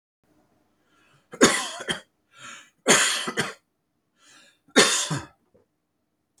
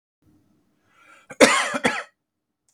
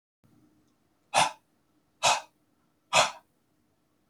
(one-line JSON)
{"three_cough_length": "6.4 s", "three_cough_amplitude": 28573, "three_cough_signal_mean_std_ratio": 0.34, "cough_length": "2.7 s", "cough_amplitude": 31650, "cough_signal_mean_std_ratio": 0.3, "exhalation_length": "4.1 s", "exhalation_amplitude": 15695, "exhalation_signal_mean_std_ratio": 0.27, "survey_phase": "beta (2021-08-13 to 2022-03-07)", "age": "65+", "gender": "Male", "wearing_mask": "No", "symptom_none": true, "smoker_status": "Ex-smoker", "respiratory_condition_asthma": false, "respiratory_condition_other": false, "recruitment_source": "REACT", "submission_delay": "0 days", "covid_test_result": "Negative", "covid_test_method": "RT-qPCR", "influenza_a_test_result": "Negative", "influenza_b_test_result": "Negative"}